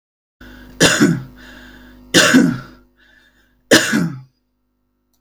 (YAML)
three_cough_length: 5.2 s
three_cough_amplitude: 32768
three_cough_signal_mean_std_ratio: 0.41
survey_phase: beta (2021-08-13 to 2022-03-07)
age: 45-64
gender: Female
wearing_mask: 'No'
symptom_none: true
smoker_status: Ex-smoker
respiratory_condition_asthma: false
respiratory_condition_other: false
recruitment_source: REACT
submission_delay: 2 days
covid_test_result: Negative
covid_test_method: RT-qPCR
influenza_a_test_result: Negative
influenza_b_test_result: Negative